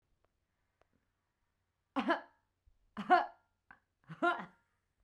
{"three_cough_length": "5.0 s", "three_cough_amplitude": 5590, "three_cough_signal_mean_std_ratio": 0.26, "survey_phase": "beta (2021-08-13 to 2022-03-07)", "age": "18-44", "gender": "Female", "wearing_mask": "No", "symptom_none": true, "smoker_status": "Never smoked", "respiratory_condition_asthma": false, "respiratory_condition_other": false, "recruitment_source": "REACT", "submission_delay": "3 days", "covid_test_result": "Negative", "covid_test_method": "RT-qPCR", "influenza_a_test_result": "Unknown/Void", "influenza_b_test_result": "Unknown/Void"}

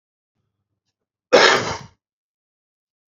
{"cough_length": "3.1 s", "cough_amplitude": 29670, "cough_signal_mean_std_ratio": 0.26, "survey_phase": "beta (2021-08-13 to 2022-03-07)", "age": "45-64", "gender": "Male", "wearing_mask": "No", "symptom_cough_any": true, "symptom_runny_or_blocked_nose": true, "smoker_status": "Prefer not to say", "respiratory_condition_asthma": false, "respiratory_condition_other": false, "recruitment_source": "REACT", "submission_delay": "1 day", "covid_test_result": "Negative", "covid_test_method": "RT-qPCR"}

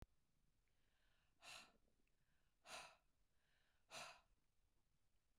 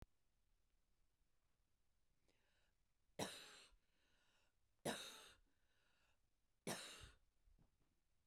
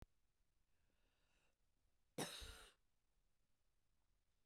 {"exhalation_length": "5.4 s", "exhalation_amplitude": 250, "exhalation_signal_mean_std_ratio": 0.44, "three_cough_length": "8.3 s", "three_cough_amplitude": 863, "three_cough_signal_mean_std_ratio": 0.31, "cough_length": "4.5 s", "cough_amplitude": 776, "cough_signal_mean_std_ratio": 0.29, "survey_phase": "beta (2021-08-13 to 2022-03-07)", "age": "45-64", "gender": "Female", "wearing_mask": "No", "symptom_none": true, "symptom_onset": "12 days", "smoker_status": "Never smoked", "respiratory_condition_asthma": false, "respiratory_condition_other": false, "recruitment_source": "REACT", "submission_delay": "1 day", "covid_test_result": "Negative", "covid_test_method": "RT-qPCR"}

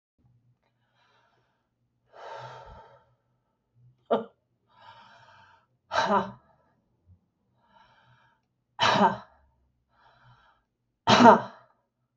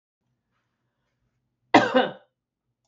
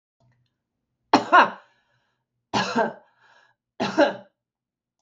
{"exhalation_length": "12.2 s", "exhalation_amplitude": 29578, "exhalation_signal_mean_std_ratio": 0.23, "cough_length": "2.9 s", "cough_amplitude": 24782, "cough_signal_mean_std_ratio": 0.23, "three_cough_length": "5.0 s", "three_cough_amplitude": 25364, "three_cough_signal_mean_std_ratio": 0.3, "survey_phase": "beta (2021-08-13 to 2022-03-07)", "age": "45-64", "gender": "Female", "wearing_mask": "No", "symptom_none": true, "smoker_status": "Ex-smoker", "respiratory_condition_asthma": false, "respiratory_condition_other": false, "recruitment_source": "REACT", "submission_delay": "1 day", "covid_test_result": "Negative", "covid_test_method": "RT-qPCR", "influenza_a_test_result": "Negative", "influenza_b_test_result": "Negative"}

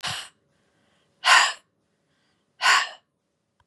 {"exhalation_length": "3.7 s", "exhalation_amplitude": 21652, "exhalation_signal_mean_std_ratio": 0.32, "survey_phase": "beta (2021-08-13 to 2022-03-07)", "age": "45-64", "gender": "Female", "wearing_mask": "No", "symptom_cough_any": true, "symptom_runny_or_blocked_nose": true, "symptom_onset": "7 days", "smoker_status": "Never smoked", "respiratory_condition_asthma": false, "respiratory_condition_other": false, "recruitment_source": "REACT", "submission_delay": "2 days", "covid_test_result": "Negative", "covid_test_method": "RT-qPCR", "influenza_a_test_result": "Negative", "influenza_b_test_result": "Negative"}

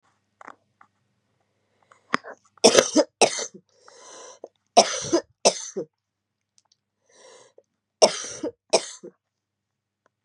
{"three_cough_length": "10.2 s", "three_cough_amplitude": 32767, "three_cough_signal_mean_std_ratio": 0.25, "survey_phase": "beta (2021-08-13 to 2022-03-07)", "age": "45-64", "gender": "Female", "wearing_mask": "No", "symptom_cough_any": true, "symptom_runny_or_blocked_nose": true, "symptom_shortness_of_breath": true, "symptom_fatigue": true, "symptom_headache": true, "smoker_status": "Ex-smoker", "respiratory_condition_asthma": false, "respiratory_condition_other": true, "recruitment_source": "Test and Trace", "submission_delay": "1 day", "covid_test_result": "Positive", "covid_test_method": "RT-qPCR", "covid_ct_value": 14.3, "covid_ct_gene": "ORF1ab gene"}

